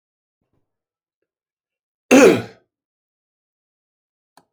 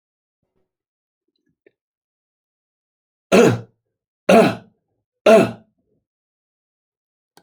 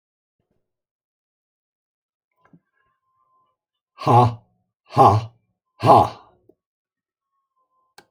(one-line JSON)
{"cough_length": "4.5 s", "cough_amplitude": 29787, "cough_signal_mean_std_ratio": 0.2, "three_cough_length": "7.4 s", "three_cough_amplitude": 31925, "three_cough_signal_mean_std_ratio": 0.25, "exhalation_length": "8.1 s", "exhalation_amplitude": 28929, "exhalation_signal_mean_std_ratio": 0.25, "survey_phase": "beta (2021-08-13 to 2022-03-07)", "age": "65+", "gender": "Male", "wearing_mask": "No", "symptom_cough_any": true, "symptom_fatigue": true, "symptom_onset": "3 days", "smoker_status": "Never smoked", "respiratory_condition_asthma": false, "respiratory_condition_other": false, "recruitment_source": "Test and Trace", "submission_delay": "1 day", "covid_test_result": "Positive", "covid_test_method": "RT-qPCR", "covid_ct_value": 22.5, "covid_ct_gene": "ORF1ab gene"}